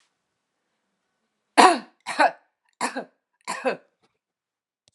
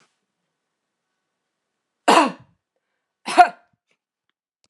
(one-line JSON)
{"three_cough_length": "4.9 s", "three_cough_amplitude": 32439, "three_cough_signal_mean_std_ratio": 0.25, "cough_length": "4.7 s", "cough_amplitude": 32767, "cough_signal_mean_std_ratio": 0.21, "survey_phase": "alpha (2021-03-01 to 2021-08-12)", "age": "65+", "gender": "Female", "wearing_mask": "No", "symptom_none": true, "smoker_status": "Never smoked", "respiratory_condition_asthma": false, "respiratory_condition_other": false, "recruitment_source": "REACT", "submission_delay": "5 days", "covid_test_result": "Negative", "covid_test_method": "RT-qPCR"}